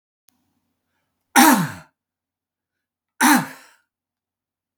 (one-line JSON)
{"cough_length": "4.8 s", "cough_amplitude": 32217, "cough_signal_mean_std_ratio": 0.27, "survey_phase": "beta (2021-08-13 to 2022-03-07)", "age": "65+", "gender": "Male", "wearing_mask": "No", "symptom_none": true, "smoker_status": "Never smoked", "respiratory_condition_asthma": false, "respiratory_condition_other": false, "recruitment_source": "REACT", "submission_delay": "5 days", "covid_test_result": "Negative", "covid_test_method": "RT-qPCR", "influenza_a_test_result": "Negative", "influenza_b_test_result": "Negative"}